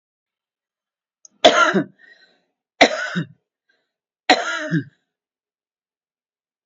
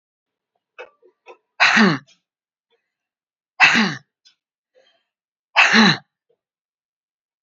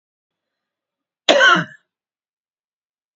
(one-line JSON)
{"three_cough_length": "6.7 s", "three_cough_amplitude": 30717, "three_cough_signal_mean_std_ratio": 0.29, "exhalation_length": "7.4 s", "exhalation_amplitude": 30318, "exhalation_signal_mean_std_ratio": 0.31, "cough_length": "3.2 s", "cough_amplitude": 29132, "cough_signal_mean_std_ratio": 0.27, "survey_phase": "beta (2021-08-13 to 2022-03-07)", "age": "65+", "gender": "Female", "wearing_mask": "No", "symptom_none": true, "smoker_status": "Ex-smoker", "respiratory_condition_asthma": false, "respiratory_condition_other": false, "recruitment_source": "REACT", "submission_delay": "4 days", "covid_test_result": "Negative", "covid_test_method": "RT-qPCR", "influenza_a_test_result": "Negative", "influenza_b_test_result": "Negative"}